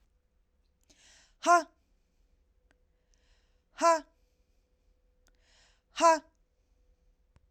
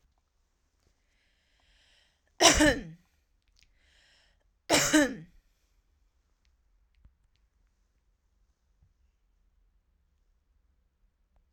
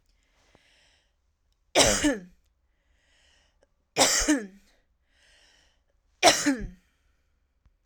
{"exhalation_length": "7.5 s", "exhalation_amplitude": 8594, "exhalation_signal_mean_std_ratio": 0.22, "cough_length": "11.5 s", "cough_amplitude": 22496, "cough_signal_mean_std_ratio": 0.21, "three_cough_length": "7.9 s", "three_cough_amplitude": 28381, "three_cough_signal_mean_std_ratio": 0.31, "survey_phase": "alpha (2021-03-01 to 2021-08-12)", "age": "45-64", "gender": "Female", "wearing_mask": "No", "symptom_none": true, "smoker_status": "Never smoked", "respiratory_condition_asthma": false, "respiratory_condition_other": false, "recruitment_source": "REACT", "submission_delay": "2 days", "covid_test_result": "Negative", "covid_test_method": "RT-qPCR"}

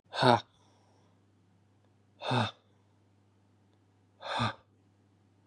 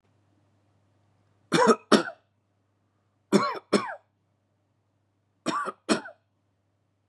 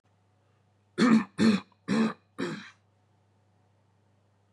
{"exhalation_length": "5.5 s", "exhalation_amplitude": 15171, "exhalation_signal_mean_std_ratio": 0.27, "three_cough_length": "7.1 s", "three_cough_amplitude": 20108, "three_cough_signal_mean_std_ratio": 0.28, "cough_length": "4.5 s", "cough_amplitude": 9887, "cough_signal_mean_std_ratio": 0.36, "survey_phase": "beta (2021-08-13 to 2022-03-07)", "age": "18-44", "gender": "Male", "wearing_mask": "No", "symptom_none": true, "smoker_status": "Never smoked", "respiratory_condition_asthma": false, "respiratory_condition_other": false, "recruitment_source": "REACT", "submission_delay": "1 day", "covid_test_result": "Negative", "covid_test_method": "RT-qPCR"}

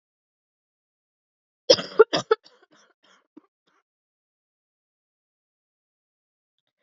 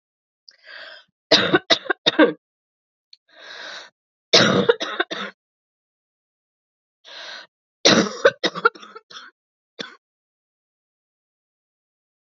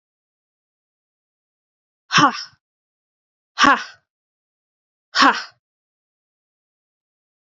{"cough_length": "6.8 s", "cough_amplitude": 26346, "cough_signal_mean_std_ratio": 0.13, "three_cough_length": "12.2 s", "three_cough_amplitude": 32768, "three_cough_signal_mean_std_ratio": 0.29, "exhalation_length": "7.4 s", "exhalation_amplitude": 30522, "exhalation_signal_mean_std_ratio": 0.22, "survey_phase": "beta (2021-08-13 to 2022-03-07)", "age": "18-44", "gender": "Female", "wearing_mask": "No", "symptom_cough_any": true, "symptom_runny_or_blocked_nose": true, "symptom_shortness_of_breath": true, "symptom_fatigue": true, "symptom_headache": true, "smoker_status": "Never smoked", "respiratory_condition_asthma": false, "respiratory_condition_other": false, "recruitment_source": "Test and Trace", "submission_delay": "2 days", "covid_test_result": "Positive", "covid_test_method": "RT-qPCR", "covid_ct_value": 23.4, "covid_ct_gene": "N gene", "covid_ct_mean": 23.7, "covid_viral_load": "16000 copies/ml", "covid_viral_load_category": "Low viral load (10K-1M copies/ml)"}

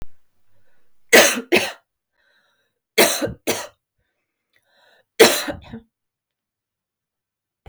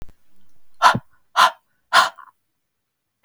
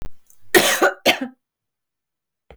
{"three_cough_length": "7.7 s", "three_cough_amplitude": 32768, "three_cough_signal_mean_std_ratio": 0.29, "exhalation_length": "3.2 s", "exhalation_amplitude": 32768, "exhalation_signal_mean_std_ratio": 0.33, "cough_length": "2.6 s", "cough_amplitude": 32768, "cough_signal_mean_std_ratio": 0.4, "survey_phase": "beta (2021-08-13 to 2022-03-07)", "age": "45-64", "gender": "Female", "wearing_mask": "No", "symptom_none": true, "smoker_status": "Never smoked", "respiratory_condition_asthma": false, "respiratory_condition_other": false, "recruitment_source": "REACT", "submission_delay": "2 days", "covid_test_result": "Negative", "covid_test_method": "RT-qPCR", "influenza_a_test_result": "Negative", "influenza_b_test_result": "Negative"}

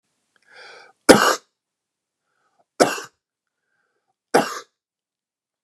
{"three_cough_length": "5.6 s", "three_cough_amplitude": 32768, "three_cough_signal_mean_std_ratio": 0.22, "survey_phase": "beta (2021-08-13 to 2022-03-07)", "age": "18-44", "gender": "Male", "wearing_mask": "No", "symptom_none": true, "smoker_status": "Never smoked", "respiratory_condition_asthma": false, "respiratory_condition_other": false, "recruitment_source": "REACT", "submission_delay": "1 day", "covid_test_result": "Negative", "covid_test_method": "RT-qPCR", "influenza_a_test_result": "Negative", "influenza_b_test_result": "Negative"}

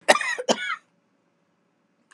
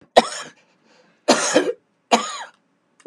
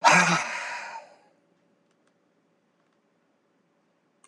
{"cough_length": "2.1 s", "cough_amplitude": 31135, "cough_signal_mean_std_ratio": 0.31, "three_cough_length": "3.1 s", "three_cough_amplitude": 32768, "three_cough_signal_mean_std_ratio": 0.35, "exhalation_length": "4.3 s", "exhalation_amplitude": 18737, "exhalation_signal_mean_std_ratio": 0.29, "survey_phase": "beta (2021-08-13 to 2022-03-07)", "age": "45-64", "gender": "Male", "wearing_mask": "No", "symptom_cough_any": true, "symptom_runny_or_blocked_nose": true, "smoker_status": "Ex-smoker", "respiratory_condition_asthma": false, "respiratory_condition_other": true, "recruitment_source": "REACT", "submission_delay": "5 days", "covid_test_result": "Negative", "covid_test_method": "RT-qPCR"}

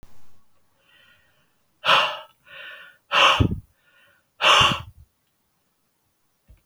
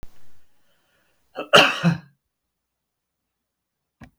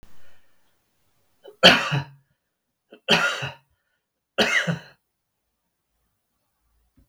{"exhalation_length": "6.7 s", "exhalation_amplitude": 24742, "exhalation_signal_mean_std_ratio": 0.34, "cough_length": "4.2 s", "cough_amplitude": 32768, "cough_signal_mean_std_ratio": 0.26, "three_cough_length": "7.1 s", "three_cough_amplitude": 32768, "three_cough_signal_mean_std_ratio": 0.29, "survey_phase": "beta (2021-08-13 to 2022-03-07)", "age": "65+", "gender": "Male", "wearing_mask": "No", "symptom_none": true, "smoker_status": "Ex-smoker", "respiratory_condition_asthma": false, "respiratory_condition_other": false, "recruitment_source": "REACT", "submission_delay": "2 days", "covid_test_result": "Negative", "covid_test_method": "RT-qPCR"}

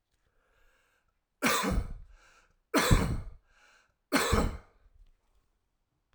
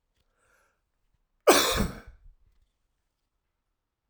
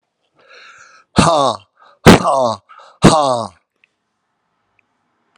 {"three_cough_length": "6.1 s", "three_cough_amplitude": 13095, "three_cough_signal_mean_std_ratio": 0.38, "cough_length": "4.1 s", "cough_amplitude": 21314, "cough_signal_mean_std_ratio": 0.24, "exhalation_length": "5.4 s", "exhalation_amplitude": 32768, "exhalation_signal_mean_std_ratio": 0.35, "survey_phase": "alpha (2021-03-01 to 2021-08-12)", "age": "45-64", "gender": "Male", "wearing_mask": "No", "symptom_cough_any": true, "symptom_shortness_of_breath": true, "symptom_headache": true, "symptom_onset": "2 days", "smoker_status": "Never smoked", "respiratory_condition_asthma": false, "respiratory_condition_other": false, "recruitment_source": "Test and Trace", "submission_delay": "2 days", "covid_test_result": "Positive", "covid_test_method": "RT-qPCR", "covid_ct_value": 21.9, "covid_ct_gene": "ORF1ab gene"}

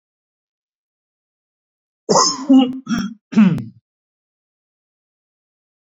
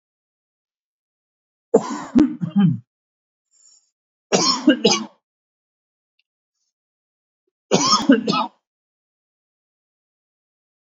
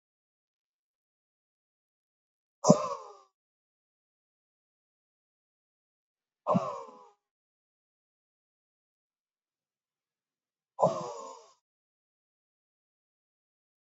{"cough_length": "6.0 s", "cough_amplitude": 29068, "cough_signal_mean_std_ratio": 0.32, "three_cough_length": "10.8 s", "three_cough_amplitude": 30859, "three_cough_signal_mean_std_ratio": 0.32, "exhalation_length": "13.8 s", "exhalation_amplitude": 19567, "exhalation_signal_mean_std_ratio": 0.17, "survey_phase": "beta (2021-08-13 to 2022-03-07)", "age": "45-64", "gender": "Male", "wearing_mask": "No", "symptom_none": true, "smoker_status": "Never smoked", "respiratory_condition_asthma": true, "respiratory_condition_other": false, "recruitment_source": "REACT", "submission_delay": "2 days", "covid_test_result": "Negative", "covid_test_method": "RT-qPCR", "influenza_a_test_result": "Unknown/Void", "influenza_b_test_result": "Unknown/Void"}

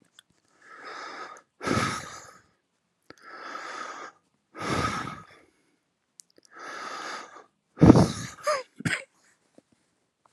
{"exhalation_length": "10.3 s", "exhalation_amplitude": 32767, "exhalation_signal_mean_std_ratio": 0.29, "survey_phase": "alpha (2021-03-01 to 2021-08-12)", "age": "18-44", "gender": "Male", "wearing_mask": "No", "symptom_cough_any": true, "symptom_fever_high_temperature": true, "symptom_headache": true, "symptom_onset": "4 days", "smoker_status": "Ex-smoker", "respiratory_condition_asthma": false, "respiratory_condition_other": false, "recruitment_source": "Test and Trace", "submission_delay": "2 days", "covid_test_result": "Positive", "covid_test_method": "RT-qPCR", "covid_ct_value": 15.2, "covid_ct_gene": "N gene", "covid_ct_mean": 15.3, "covid_viral_load": "9700000 copies/ml", "covid_viral_load_category": "High viral load (>1M copies/ml)"}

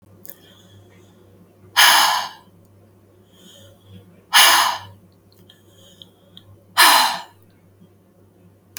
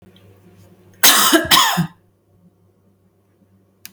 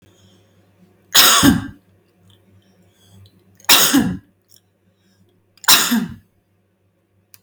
{"exhalation_length": "8.8 s", "exhalation_amplitude": 32768, "exhalation_signal_mean_std_ratio": 0.33, "cough_length": "3.9 s", "cough_amplitude": 32768, "cough_signal_mean_std_ratio": 0.37, "three_cough_length": "7.4 s", "three_cough_amplitude": 32768, "three_cough_signal_mean_std_ratio": 0.34, "survey_phase": "beta (2021-08-13 to 2022-03-07)", "age": "45-64", "gender": "Female", "wearing_mask": "No", "symptom_none": true, "smoker_status": "Never smoked", "respiratory_condition_asthma": false, "respiratory_condition_other": false, "recruitment_source": "REACT", "submission_delay": "1 day", "covid_test_result": "Negative", "covid_test_method": "RT-qPCR", "influenza_a_test_result": "Negative", "influenza_b_test_result": "Negative"}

